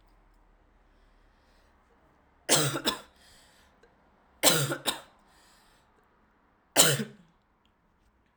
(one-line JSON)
{"three_cough_length": "8.4 s", "three_cough_amplitude": 21056, "three_cough_signal_mean_std_ratio": 0.28, "survey_phase": "alpha (2021-03-01 to 2021-08-12)", "age": "18-44", "gender": "Female", "wearing_mask": "No", "symptom_cough_any": true, "symptom_new_continuous_cough": true, "symptom_diarrhoea": true, "symptom_fatigue": true, "symptom_headache": true, "smoker_status": "Never smoked", "respiratory_condition_asthma": false, "respiratory_condition_other": false, "recruitment_source": "Test and Trace", "submission_delay": "3 days", "covid_test_result": "Positive", "covid_test_method": "RT-qPCR", "covid_ct_value": 32.3, "covid_ct_gene": "ORF1ab gene"}